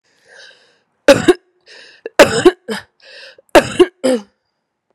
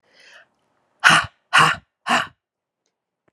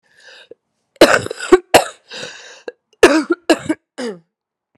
{
  "three_cough_length": "4.9 s",
  "three_cough_amplitude": 32768,
  "three_cough_signal_mean_std_ratio": 0.32,
  "exhalation_length": "3.3 s",
  "exhalation_amplitude": 32768,
  "exhalation_signal_mean_std_ratio": 0.32,
  "cough_length": "4.8 s",
  "cough_amplitude": 32768,
  "cough_signal_mean_std_ratio": 0.33,
  "survey_phase": "alpha (2021-03-01 to 2021-08-12)",
  "age": "45-64",
  "gender": "Female",
  "wearing_mask": "No",
  "symptom_cough_any": true,
  "symptom_fatigue": true,
  "symptom_headache": true,
  "symptom_onset": "3 days",
  "smoker_status": "Never smoked",
  "respiratory_condition_asthma": false,
  "respiratory_condition_other": false,
  "recruitment_source": "Test and Trace",
  "submission_delay": "2 days",
  "covid_test_result": "Positive",
  "covid_test_method": "RT-qPCR",
  "covid_ct_value": 21.4,
  "covid_ct_gene": "ORF1ab gene",
  "covid_ct_mean": 21.9,
  "covid_viral_load": "67000 copies/ml",
  "covid_viral_load_category": "Low viral load (10K-1M copies/ml)"
}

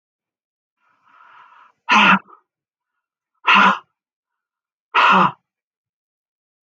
{
  "exhalation_length": "6.7 s",
  "exhalation_amplitude": 31923,
  "exhalation_signal_mean_std_ratio": 0.31,
  "survey_phase": "beta (2021-08-13 to 2022-03-07)",
  "age": "65+",
  "gender": "Female",
  "wearing_mask": "No",
  "symptom_cough_any": true,
  "smoker_status": "Ex-smoker",
  "respiratory_condition_asthma": false,
  "respiratory_condition_other": false,
  "recruitment_source": "REACT",
  "submission_delay": "1 day",
  "covid_test_result": "Negative",
  "covid_test_method": "RT-qPCR",
  "influenza_a_test_result": "Negative",
  "influenza_b_test_result": "Negative"
}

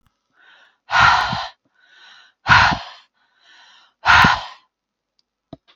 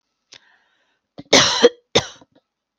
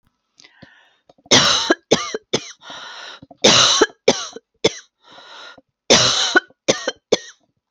{
  "exhalation_length": "5.8 s",
  "exhalation_amplitude": 32768,
  "exhalation_signal_mean_std_ratio": 0.36,
  "cough_length": "2.8 s",
  "cough_amplitude": 32768,
  "cough_signal_mean_std_ratio": 0.29,
  "three_cough_length": "7.7 s",
  "three_cough_amplitude": 32768,
  "three_cough_signal_mean_std_ratio": 0.4,
  "survey_phase": "beta (2021-08-13 to 2022-03-07)",
  "age": "45-64",
  "gender": "Female",
  "wearing_mask": "No",
  "symptom_none": true,
  "smoker_status": "Never smoked",
  "respiratory_condition_asthma": false,
  "respiratory_condition_other": false,
  "recruitment_source": "REACT",
  "submission_delay": "1 day",
  "covid_test_result": "Negative",
  "covid_test_method": "RT-qPCR",
  "influenza_a_test_result": "Negative",
  "influenza_b_test_result": "Negative"
}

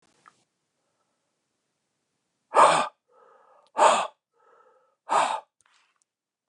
{
  "exhalation_length": "6.5 s",
  "exhalation_amplitude": 20565,
  "exhalation_signal_mean_std_ratio": 0.28,
  "survey_phase": "beta (2021-08-13 to 2022-03-07)",
  "age": "45-64",
  "gender": "Male",
  "wearing_mask": "No",
  "symptom_cough_any": true,
  "symptom_runny_or_blocked_nose": true,
  "symptom_sore_throat": true,
  "symptom_headache": true,
  "symptom_onset": "5 days",
  "smoker_status": "Never smoked",
  "respiratory_condition_asthma": false,
  "respiratory_condition_other": false,
  "recruitment_source": "Test and Trace",
  "submission_delay": "2 days",
  "covid_test_result": "Positive",
  "covid_test_method": "RT-qPCR"
}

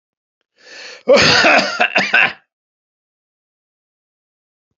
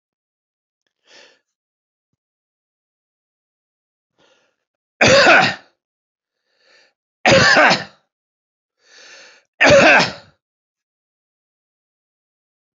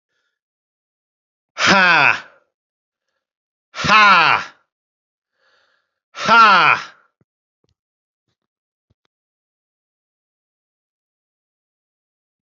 {
  "cough_length": "4.8 s",
  "cough_amplitude": 31616,
  "cough_signal_mean_std_ratio": 0.39,
  "three_cough_length": "12.8 s",
  "three_cough_amplitude": 31435,
  "three_cough_signal_mean_std_ratio": 0.29,
  "exhalation_length": "12.5 s",
  "exhalation_amplitude": 30922,
  "exhalation_signal_mean_std_ratio": 0.29,
  "survey_phase": "alpha (2021-03-01 to 2021-08-12)",
  "age": "45-64",
  "gender": "Male",
  "wearing_mask": "No",
  "symptom_change_to_sense_of_smell_or_taste": true,
  "smoker_status": "Ex-smoker",
  "respiratory_condition_asthma": false,
  "respiratory_condition_other": false,
  "recruitment_source": "REACT",
  "submission_delay": "11 days",
  "covid_test_result": "Negative",
  "covid_test_method": "RT-qPCR"
}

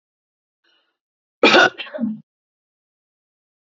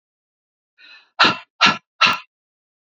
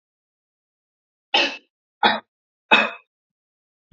{
  "cough_length": "3.8 s",
  "cough_amplitude": 29589,
  "cough_signal_mean_std_ratio": 0.26,
  "exhalation_length": "2.9 s",
  "exhalation_amplitude": 32768,
  "exhalation_signal_mean_std_ratio": 0.31,
  "three_cough_length": "3.9 s",
  "three_cough_amplitude": 26493,
  "three_cough_signal_mean_std_ratio": 0.27,
  "survey_phase": "beta (2021-08-13 to 2022-03-07)",
  "age": "45-64",
  "gender": "Female",
  "wearing_mask": "No",
  "symptom_none": true,
  "symptom_onset": "13 days",
  "smoker_status": "Never smoked",
  "respiratory_condition_asthma": false,
  "respiratory_condition_other": false,
  "recruitment_source": "REACT",
  "submission_delay": "2 days",
  "covid_test_result": "Negative",
  "covid_test_method": "RT-qPCR"
}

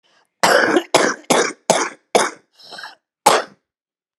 {
  "cough_length": "4.2 s",
  "cough_amplitude": 32768,
  "cough_signal_mean_std_ratio": 0.45,
  "survey_phase": "alpha (2021-03-01 to 2021-08-12)",
  "age": "65+",
  "gender": "Female",
  "wearing_mask": "No",
  "symptom_none": true,
  "smoker_status": "Ex-smoker",
  "respiratory_condition_asthma": true,
  "respiratory_condition_other": false,
  "recruitment_source": "REACT",
  "submission_delay": "3 days",
  "covid_test_result": "Negative",
  "covid_test_method": "RT-qPCR"
}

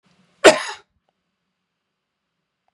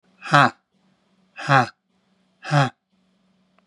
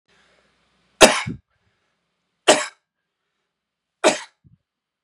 {
  "cough_length": "2.7 s",
  "cough_amplitude": 32768,
  "cough_signal_mean_std_ratio": 0.17,
  "exhalation_length": "3.7 s",
  "exhalation_amplitude": 32767,
  "exhalation_signal_mean_std_ratio": 0.3,
  "three_cough_length": "5.0 s",
  "three_cough_amplitude": 32768,
  "three_cough_signal_mean_std_ratio": 0.22,
  "survey_phase": "beta (2021-08-13 to 2022-03-07)",
  "age": "45-64",
  "gender": "Male",
  "wearing_mask": "No",
  "symptom_shortness_of_breath": true,
  "symptom_fatigue": true,
  "symptom_loss_of_taste": true,
  "smoker_status": "Never smoked",
  "respiratory_condition_asthma": false,
  "respiratory_condition_other": false,
  "recruitment_source": "REACT",
  "submission_delay": "1 day",
  "covid_test_result": "Negative",
  "covid_test_method": "RT-qPCR",
  "influenza_a_test_result": "Negative",
  "influenza_b_test_result": "Negative"
}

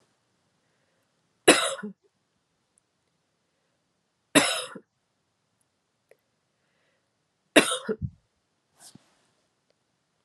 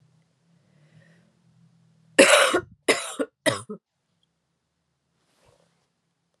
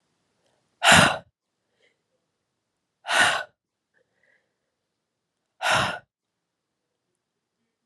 {
  "three_cough_length": "10.2 s",
  "three_cough_amplitude": 29429,
  "three_cough_signal_mean_std_ratio": 0.19,
  "cough_length": "6.4 s",
  "cough_amplitude": 30475,
  "cough_signal_mean_std_ratio": 0.25,
  "exhalation_length": "7.9 s",
  "exhalation_amplitude": 25928,
  "exhalation_signal_mean_std_ratio": 0.26,
  "survey_phase": "beta (2021-08-13 to 2022-03-07)",
  "age": "18-44",
  "gender": "Female",
  "wearing_mask": "No",
  "symptom_runny_or_blocked_nose": true,
  "symptom_fatigue": true,
  "symptom_fever_high_temperature": true,
  "symptom_change_to_sense_of_smell_or_taste": true,
  "symptom_loss_of_taste": true,
  "symptom_other": true,
  "symptom_onset": "3 days",
  "smoker_status": "Never smoked",
  "respiratory_condition_asthma": false,
  "respiratory_condition_other": false,
  "recruitment_source": "Test and Trace",
  "submission_delay": "2 days",
  "covid_test_result": "Positive",
  "covid_test_method": "RT-qPCR",
  "covid_ct_value": 31.9,
  "covid_ct_gene": "ORF1ab gene"
}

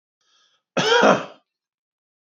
{
  "cough_length": "2.4 s",
  "cough_amplitude": 26822,
  "cough_signal_mean_std_ratio": 0.34,
  "survey_phase": "beta (2021-08-13 to 2022-03-07)",
  "age": "45-64",
  "gender": "Male",
  "wearing_mask": "No",
  "symptom_none": true,
  "smoker_status": "Never smoked",
  "respiratory_condition_asthma": false,
  "respiratory_condition_other": false,
  "recruitment_source": "REACT",
  "submission_delay": "1 day",
  "covid_test_result": "Negative",
  "covid_test_method": "RT-qPCR",
  "influenza_a_test_result": "Negative",
  "influenza_b_test_result": "Negative"
}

